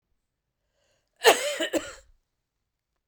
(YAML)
cough_length: 3.1 s
cough_amplitude: 27084
cough_signal_mean_std_ratio: 0.26
survey_phase: beta (2021-08-13 to 2022-03-07)
age: 45-64
gender: Female
wearing_mask: 'No'
symptom_cough_any: true
symptom_runny_or_blocked_nose: true
symptom_fatigue: true
symptom_change_to_sense_of_smell_or_taste: true
smoker_status: Ex-smoker
respiratory_condition_asthma: false
respiratory_condition_other: false
recruitment_source: Test and Trace
submission_delay: 2 days
covid_test_result: Positive
covid_test_method: RT-qPCR
covid_ct_value: 19.2
covid_ct_gene: ORF1ab gene
covid_ct_mean: 20.2
covid_viral_load: 240000 copies/ml
covid_viral_load_category: Low viral load (10K-1M copies/ml)